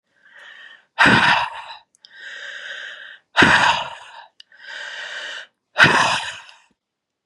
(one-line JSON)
{"exhalation_length": "7.3 s", "exhalation_amplitude": 32768, "exhalation_signal_mean_std_ratio": 0.43, "survey_phase": "beta (2021-08-13 to 2022-03-07)", "age": "45-64", "gender": "Female", "wearing_mask": "No", "symptom_none": true, "smoker_status": "Current smoker (1 to 10 cigarettes per day)", "respiratory_condition_asthma": false, "respiratory_condition_other": false, "recruitment_source": "REACT", "submission_delay": "7 days", "covid_test_result": "Negative", "covid_test_method": "RT-qPCR", "influenza_a_test_result": "Negative", "influenza_b_test_result": "Negative"}